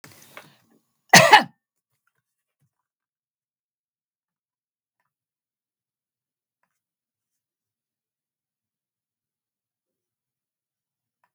{"cough_length": "11.3 s", "cough_amplitude": 32768, "cough_signal_mean_std_ratio": 0.12, "survey_phase": "beta (2021-08-13 to 2022-03-07)", "age": "65+", "gender": "Female", "wearing_mask": "No", "symptom_none": true, "symptom_onset": "12 days", "smoker_status": "Never smoked", "respiratory_condition_asthma": false, "respiratory_condition_other": false, "recruitment_source": "REACT", "submission_delay": "1 day", "covid_test_result": "Negative", "covid_test_method": "RT-qPCR"}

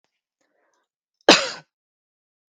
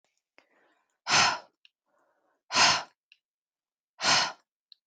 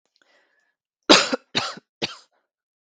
{"cough_length": "2.6 s", "cough_amplitude": 32768, "cough_signal_mean_std_ratio": 0.18, "exhalation_length": "4.9 s", "exhalation_amplitude": 12459, "exhalation_signal_mean_std_ratio": 0.33, "three_cough_length": "2.8 s", "three_cough_amplitude": 32768, "three_cough_signal_mean_std_ratio": 0.25, "survey_phase": "beta (2021-08-13 to 2022-03-07)", "age": "18-44", "gender": "Female", "wearing_mask": "No", "symptom_none": true, "smoker_status": "Never smoked", "respiratory_condition_asthma": false, "respiratory_condition_other": false, "recruitment_source": "REACT", "submission_delay": "0 days", "covid_test_result": "Negative", "covid_test_method": "RT-qPCR"}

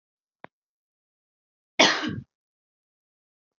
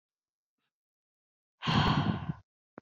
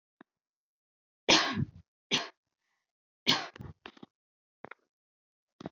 {"cough_length": "3.6 s", "cough_amplitude": 25334, "cough_signal_mean_std_ratio": 0.21, "exhalation_length": "2.8 s", "exhalation_amplitude": 6367, "exhalation_signal_mean_std_ratio": 0.38, "three_cough_length": "5.7 s", "three_cough_amplitude": 14631, "three_cough_signal_mean_std_ratio": 0.26, "survey_phase": "beta (2021-08-13 to 2022-03-07)", "age": "18-44", "gender": "Female", "wearing_mask": "No", "symptom_cough_any": true, "symptom_runny_or_blocked_nose": true, "symptom_sore_throat": true, "symptom_onset": "4 days", "smoker_status": "Never smoked", "respiratory_condition_asthma": false, "respiratory_condition_other": false, "recruitment_source": "Test and Trace", "submission_delay": "2 days", "covid_test_result": "Positive", "covid_test_method": "RT-qPCR"}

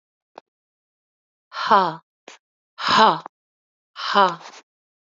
{"exhalation_length": "5.0 s", "exhalation_amplitude": 28169, "exhalation_signal_mean_std_ratio": 0.32, "survey_phase": "beta (2021-08-13 to 2022-03-07)", "age": "45-64", "gender": "Female", "wearing_mask": "No", "symptom_cough_any": true, "symptom_runny_or_blocked_nose": true, "symptom_sore_throat": true, "symptom_fatigue": true, "symptom_fever_high_temperature": true, "symptom_headache": true, "symptom_onset": "2 days", "smoker_status": "Never smoked", "respiratory_condition_asthma": false, "respiratory_condition_other": false, "recruitment_source": "Test and Trace", "submission_delay": "1 day", "covid_test_result": "Positive", "covid_test_method": "RT-qPCR", "covid_ct_value": 19.9, "covid_ct_gene": "ORF1ab gene", "covid_ct_mean": 20.4, "covid_viral_load": "200000 copies/ml", "covid_viral_load_category": "Low viral load (10K-1M copies/ml)"}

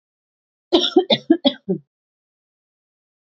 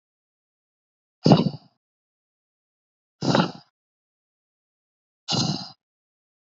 {"cough_length": "3.2 s", "cough_amplitude": 30047, "cough_signal_mean_std_ratio": 0.3, "exhalation_length": "6.6 s", "exhalation_amplitude": 24748, "exhalation_signal_mean_std_ratio": 0.25, "survey_phase": "beta (2021-08-13 to 2022-03-07)", "age": "18-44", "gender": "Female", "wearing_mask": "No", "symptom_none": true, "smoker_status": "Never smoked", "respiratory_condition_asthma": false, "respiratory_condition_other": false, "recruitment_source": "REACT", "submission_delay": "3 days", "covid_test_result": "Negative", "covid_test_method": "RT-qPCR", "influenza_a_test_result": "Negative", "influenza_b_test_result": "Negative"}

